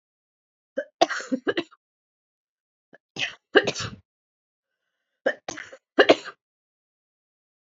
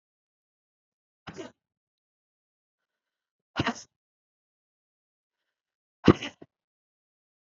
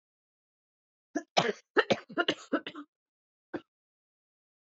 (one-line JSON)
{"three_cough_length": "7.7 s", "three_cough_amplitude": 28627, "three_cough_signal_mean_std_ratio": 0.23, "exhalation_length": "7.5 s", "exhalation_amplitude": 26109, "exhalation_signal_mean_std_ratio": 0.12, "cough_length": "4.8 s", "cough_amplitude": 10728, "cough_signal_mean_std_ratio": 0.26, "survey_phase": "beta (2021-08-13 to 2022-03-07)", "age": "45-64", "gender": "Female", "wearing_mask": "No", "symptom_cough_any": true, "symptom_fatigue": true, "symptom_headache": true, "symptom_other": true, "smoker_status": "Ex-smoker", "respiratory_condition_asthma": false, "respiratory_condition_other": false, "recruitment_source": "REACT", "submission_delay": "2 days", "covid_test_result": "Negative", "covid_test_method": "RT-qPCR", "influenza_a_test_result": "Negative", "influenza_b_test_result": "Negative"}